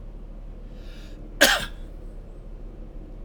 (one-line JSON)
{"cough_length": "3.2 s", "cough_amplitude": 27836, "cough_signal_mean_std_ratio": 0.51, "survey_phase": "alpha (2021-03-01 to 2021-08-12)", "age": "45-64", "gender": "Male", "wearing_mask": "No", "symptom_none": true, "symptom_onset": "4 days", "smoker_status": "Ex-smoker", "respiratory_condition_asthma": false, "respiratory_condition_other": false, "recruitment_source": "REACT", "submission_delay": "3 days", "covid_test_result": "Negative", "covid_test_method": "RT-qPCR"}